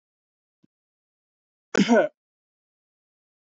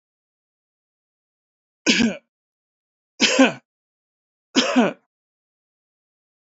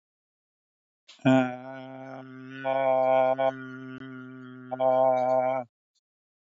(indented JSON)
{
  "cough_length": "3.5 s",
  "cough_amplitude": 14821,
  "cough_signal_mean_std_ratio": 0.22,
  "three_cough_length": "6.5 s",
  "three_cough_amplitude": 27435,
  "three_cough_signal_mean_std_ratio": 0.28,
  "exhalation_length": "6.5 s",
  "exhalation_amplitude": 10716,
  "exhalation_signal_mean_std_ratio": 0.53,
  "survey_phase": "beta (2021-08-13 to 2022-03-07)",
  "age": "65+",
  "gender": "Male",
  "wearing_mask": "No",
  "symptom_sore_throat": true,
  "smoker_status": "Ex-smoker",
  "respiratory_condition_asthma": false,
  "respiratory_condition_other": false,
  "recruitment_source": "REACT",
  "submission_delay": "1 day",
  "covid_test_result": "Negative",
  "covid_test_method": "RT-qPCR",
  "influenza_a_test_result": "Negative",
  "influenza_b_test_result": "Negative"
}